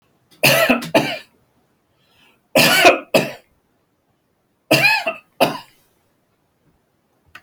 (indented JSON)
{
  "three_cough_length": "7.4 s",
  "three_cough_amplitude": 32767,
  "three_cough_signal_mean_std_ratio": 0.38,
  "survey_phase": "beta (2021-08-13 to 2022-03-07)",
  "age": "65+",
  "gender": "Male",
  "wearing_mask": "No",
  "symptom_none": true,
  "smoker_status": "Ex-smoker",
  "respiratory_condition_asthma": false,
  "respiratory_condition_other": false,
  "recruitment_source": "REACT",
  "submission_delay": "2 days",
  "covid_test_result": "Negative",
  "covid_test_method": "RT-qPCR"
}